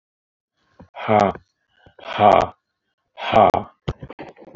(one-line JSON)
{"exhalation_length": "4.6 s", "exhalation_amplitude": 27587, "exhalation_signal_mean_std_ratio": 0.34, "survey_phase": "alpha (2021-03-01 to 2021-08-12)", "age": "45-64", "gender": "Male", "wearing_mask": "No", "symptom_none": true, "smoker_status": "Ex-smoker", "respiratory_condition_asthma": false, "respiratory_condition_other": false, "recruitment_source": "REACT", "submission_delay": "10 days", "covid_test_result": "Negative", "covid_test_method": "RT-qPCR"}